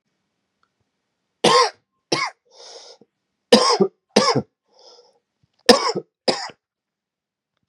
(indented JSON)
{
  "three_cough_length": "7.7 s",
  "three_cough_amplitude": 32768,
  "three_cough_signal_mean_std_ratio": 0.31,
  "survey_phase": "beta (2021-08-13 to 2022-03-07)",
  "age": "18-44",
  "gender": "Male",
  "wearing_mask": "No",
  "symptom_cough_any": true,
  "symptom_runny_or_blocked_nose": true,
  "symptom_sore_throat": true,
  "symptom_abdominal_pain": true,
  "symptom_fatigue": true,
  "symptom_fever_high_temperature": true,
  "symptom_headache": true,
  "symptom_loss_of_taste": true,
  "symptom_onset": "3 days",
  "smoker_status": "Never smoked",
  "respiratory_condition_asthma": false,
  "respiratory_condition_other": false,
  "recruitment_source": "Test and Trace",
  "submission_delay": "1 day",
  "covid_test_result": "Positive",
  "covid_test_method": "RT-qPCR",
  "covid_ct_value": 15.8,
  "covid_ct_gene": "ORF1ab gene",
  "covid_ct_mean": 16.1,
  "covid_viral_load": "5400000 copies/ml",
  "covid_viral_load_category": "High viral load (>1M copies/ml)"
}